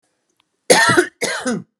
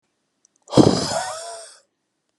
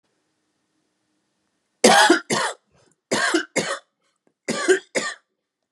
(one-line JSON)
{"cough_length": "1.8 s", "cough_amplitude": 32768, "cough_signal_mean_std_ratio": 0.48, "exhalation_length": "2.4 s", "exhalation_amplitude": 32621, "exhalation_signal_mean_std_ratio": 0.34, "three_cough_length": "5.7 s", "three_cough_amplitude": 31959, "three_cough_signal_mean_std_ratio": 0.37, "survey_phase": "beta (2021-08-13 to 2022-03-07)", "age": "18-44", "gender": "Male", "wearing_mask": "No", "symptom_none": true, "smoker_status": "Ex-smoker", "respiratory_condition_asthma": false, "respiratory_condition_other": false, "recruitment_source": "REACT", "submission_delay": "1 day", "covid_test_result": "Negative", "covid_test_method": "RT-qPCR"}